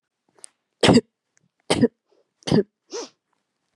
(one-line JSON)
{"three_cough_length": "3.8 s", "three_cough_amplitude": 28369, "three_cough_signal_mean_std_ratio": 0.28, "survey_phase": "beta (2021-08-13 to 2022-03-07)", "age": "18-44", "gender": "Female", "wearing_mask": "No", "symptom_runny_or_blocked_nose": true, "smoker_status": "Never smoked", "respiratory_condition_asthma": false, "respiratory_condition_other": false, "recruitment_source": "REACT", "submission_delay": "2 days", "covid_test_result": "Negative", "covid_test_method": "RT-qPCR", "influenza_a_test_result": "Negative", "influenza_b_test_result": "Negative"}